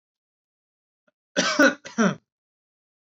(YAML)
cough_length: 3.1 s
cough_amplitude: 18511
cough_signal_mean_std_ratio: 0.31
survey_phase: alpha (2021-03-01 to 2021-08-12)
age: 18-44
gender: Male
wearing_mask: 'No'
symptom_none: true
smoker_status: Never smoked
respiratory_condition_asthma: false
respiratory_condition_other: false
recruitment_source: Test and Trace
submission_delay: 2 days
covid_test_result: Positive
covid_test_method: RT-qPCR
covid_ct_value: 30.6
covid_ct_gene: ORF1ab gene
covid_ct_mean: 30.9
covid_viral_load: 74 copies/ml
covid_viral_load_category: Minimal viral load (< 10K copies/ml)